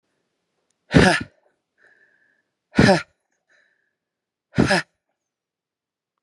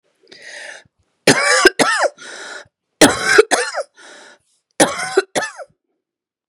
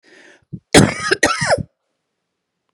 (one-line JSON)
{"exhalation_length": "6.2 s", "exhalation_amplitude": 32649, "exhalation_signal_mean_std_ratio": 0.26, "three_cough_length": "6.5 s", "three_cough_amplitude": 32768, "three_cough_signal_mean_std_ratio": 0.41, "cough_length": "2.7 s", "cough_amplitude": 32768, "cough_signal_mean_std_ratio": 0.36, "survey_phase": "beta (2021-08-13 to 2022-03-07)", "age": "18-44", "gender": "Female", "wearing_mask": "No", "symptom_cough_any": true, "symptom_runny_or_blocked_nose": true, "symptom_shortness_of_breath": true, "symptom_sore_throat": true, "smoker_status": "Never smoked", "respiratory_condition_asthma": true, "respiratory_condition_other": false, "recruitment_source": "Test and Trace", "submission_delay": "2 days", "covid_test_result": "Positive", "covid_test_method": "RT-qPCR", "covid_ct_value": 19.2, "covid_ct_gene": "ORF1ab gene", "covid_ct_mean": 19.5, "covid_viral_load": "400000 copies/ml", "covid_viral_load_category": "Low viral load (10K-1M copies/ml)"}